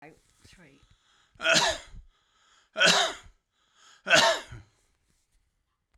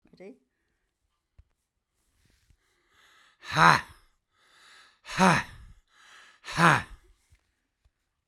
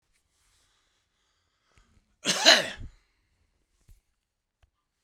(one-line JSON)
{"three_cough_length": "6.0 s", "three_cough_amplitude": 16872, "three_cough_signal_mean_std_ratio": 0.34, "exhalation_length": "8.3 s", "exhalation_amplitude": 30597, "exhalation_signal_mean_std_ratio": 0.24, "cough_length": "5.0 s", "cough_amplitude": 30111, "cough_signal_mean_std_ratio": 0.2, "survey_phase": "beta (2021-08-13 to 2022-03-07)", "age": "65+", "gender": "Male", "wearing_mask": "No", "symptom_none": true, "smoker_status": "Ex-smoker", "respiratory_condition_asthma": false, "respiratory_condition_other": false, "recruitment_source": "REACT", "submission_delay": "2 days", "covid_test_result": "Negative", "covid_test_method": "RT-qPCR"}